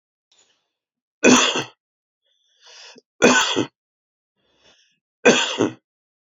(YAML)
three_cough_length: 6.4 s
three_cough_amplitude: 29080
three_cough_signal_mean_std_ratio: 0.32
survey_phase: alpha (2021-03-01 to 2021-08-12)
age: 45-64
gender: Male
wearing_mask: 'No'
symptom_new_continuous_cough: true
symptom_shortness_of_breath: true
symptom_headache: true
symptom_change_to_sense_of_smell_or_taste: true
symptom_loss_of_taste: true
symptom_onset: 3 days
smoker_status: Never smoked
respiratory_condition_asthma: false
respiratory_condition_other: false
recruitment_source: Test and Trace
submission_delay: 1 day
covid_test_result: Positive
covid_test_method: RT-qPCR
covid_ct_value: 18.5
covid_ct_gene: ORF1ab gene
covid_ct_mean: 19.3
covid_viral_load: 480000 copies/ml
covid_viral_load_category: Low viral load (10K-1M copies/ml)